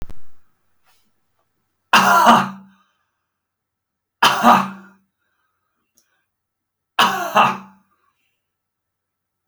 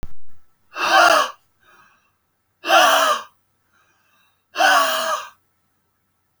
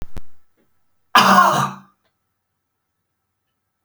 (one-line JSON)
{"three_cough_length": "9.5 s", "three_cough_amplitude": 31732, "three_cough_signal_mean_std_ratio": 0.33, "exhalation_length": "6.4 s", "exhalation_amplitude": 29177, "exhalation_signal_mean_std_ratio": 0.46, "cough_length": "3.8 s", "cough_amplitude": 29762, "cough_signal_mean_std_ratio": 0.36, "survey_phase": "beta (2021-08-13 to 2022-03-07)", "age": "65+", "gender": "Male", "wearing_mask": "No", "symptom_runny_or_blocked_nose": true, "symptom_shortness_of_breath": true, "smoker_status": "Never smoked", "respiratory_condition_asthma": true, "respiratory_condition_other": false, "recruitment_source": "REACT", "submission_delay": "4 days", "covid_test_result": "Negative", "covid_test_method": "RT-qPCR"}